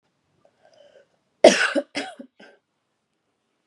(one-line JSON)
{"cough_length": "3.7 s", "cough_amplitude": 32767, "cough_signal_mean_std_ratio": 0.21, "survey_phase": "beta (2021-08-13 to 2022-03-07)", "age": "18-44", "gender": "Female", "wearing_mask": "No", "symptom_none": true, "symptom_onset": "3 days", "smoker_status": "Current smoker (1 to 10 cigarettes per day)", "respiratory_condition_asthma": false, "respiratory_condition_other": false, "recruitment_source": "REACT", "submission_delay": "1 day", "covid_test_result": "Negative", "covid_test_method": "RT-qPCR", "influenza_a_test_result": "Negative", "influenza_b_test_result": "Negative"}